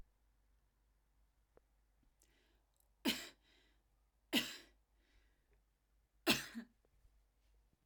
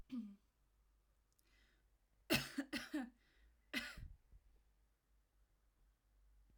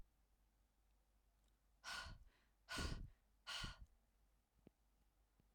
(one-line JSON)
{"three_cough_length": "7.9 s", "three_cough_amplitude": 4041, "three_cough_signal_mean_std_ratio": 0.22, "cough_length": "6.6 s", "cough_amplitude": 2449, "cough_signal_mean_std_ratio": 0.32, "exhalation_length": "5.5 s", "exhalation_amplitude": 645, "exhalation_signal_mean_std_ratio": 0.41, "survey_phase": "alpha (2021-03-01 to 2021-08-12)", "age": "18-44", "gender": "Female", "wearing_mask": "No", "symptom_none": true, "smoker_status": "Never smoked", "respiratory_condition_asthma": true, "respiratory_condition_other": false, "recruitment_source": "REACT", "submission_delay": "2 days", "covid_test_result": "Negative", "covid_test_method": "RT-qPCR"}